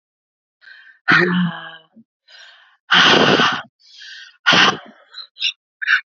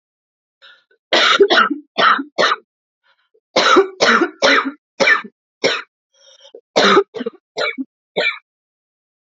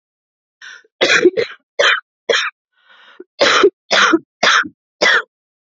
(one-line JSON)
{"exhalation_length": "6.1 s", "exhalation_amplitude": 30748, "exhalation_signal_mean_std_ratio": 0.45, "three_cough_length": "9.3 s", "three_cough_amplitude": 32767, "three_cough_signal_mean_std_ratio": 0.47, "cough_length": "5.7 s", "cough_amplitude": 31497, "cough_signal_mean_std_ratio": 0.47, "survey_phase": "beta (2021-08-13 to 2022-03-07)", "age": "18-44", "gender": "Female", "wearing_mask": "No", "symptom_cough_any": true, "symptom_new_continuous_cough": true, "symptom_runny_or_blocked_nose": true, "symptom_shortness_of_breath": true, "symptom_sore_throat": true, "symptom_diarrhoea": true, "symptom_fatigue": true, "symptom_fever_high_temperature": true, "symptom_headache": true, "symptom_change_to_sense_of_smell_or_taste": true, "symptom_onset": "3 days", "smoker_status": "Never smoked", "respiratory_condition_asthma": false, "respiratory_condition_other": false, "recruitment_source": "Test and Trace", "submission_delay": "2 days", "covid_test_result": "Positive", "covid_test_method": "RT-qPCR", "covid_ct_value": 34.0, "covid_ct_gene": "ORF1ab gene", "covid_ct_mean": 34.5, "covid_viral_load": "5 copies/ml", "covid_viral_load_category": "Minimal viral load (< 10K copies/ml)"}